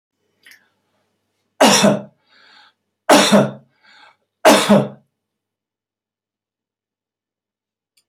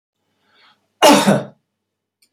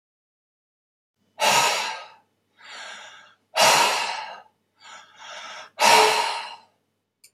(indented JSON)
{
  "three_cough_length": "8.1 s",
  "three_cough_amplitude": 32768,
  "three_cough_signal_mean_std_ratio": 0.3,
  "cough_length": "2.3 s",
  "cough_amplitude": 30218,
  "cough_signal_mean_std_ratio": 0.33,
  "exhalation_length": "7.3 s",
  "exhalation_amplitude": 25107,
  "exhalation_signal_mean_std_ratio": 0.42,
  "survey_phase": "beta (2021-08-13 to 2022-03-07)",
  "age": "65+",
  "gender": "Male",
  "wearing_mask": "No",
  "symptom_none": true,
  "smoker_status": "Never smoked",
  "respiratory_condition_asthma": false,
  "respiratory_condition_other": false,
  "recruitment_source": "REACT",
  "submission_delay": "1 day",
  "covid_test_result": "Negative",
  "covid_test_method": "RT-qPCR",
  "influenza_a_test_result": "Negative",
  "influenza_b_test_result": "Negative"
}